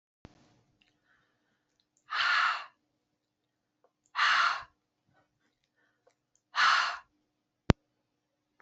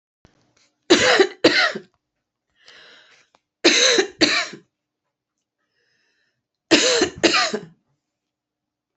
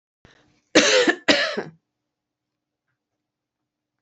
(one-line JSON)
{"exhalation_length": "8.6 s", "exhalation_amplitude": 24268, "exhalation_signal_mean_std_ratio": 0.3, "three_cough_length": "9.0 s", "three_cough_amplitude": 32483, "three_cough_signal_mean_std_ratio": 0.38, "cough_length": "4.0 s", "cough_amplitude": 29318, "cough_signal_mean_std_ratio": 0.32, "survey_phase": "alpha (2021-03-01 to 2021-08-12)", "age": "45-64", "gender": "Female", "wearing_mask": "No", "symptom_none": true, "smoker_status": "Never smoked", "respiratory_condition_asthma": false, "respiratory_condition_other": false, "recruitment_source": "REACT", "submission_delay": "1 day", "covid_test_result": "Negative", "covid_test_method": "RT-qPCR"}